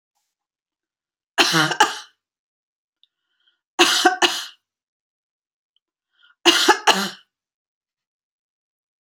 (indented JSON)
{
  "three_cough_length": "9.0 s",
  "three_cough_amplitude": 32767,
  "three_cough_signal_mean_std_ratio": 0.3,
  "survey_phase": "beta (2021-08-13 to 2022-03-07)",
  "age": "65+",
  "gender": "Female",
  "wearing_mask": "No",
  "symptom_runny_or_blocked_nose": true,
  "symptom_onset": "12 days",
  "smoker_status": "Never smoked",
  "respiratory_condition_asthma": false,
  "respiratory_condition_other": false,
  "recruitment_source": "REACT",
  "submission_delay": "1 day",
  "covid_test_result": "Negative",
  "covid_test_method": "RT-qPCR",
  "influenza_a_test_result": "Negative",
  "influenza_b_test_result": "Negative"
}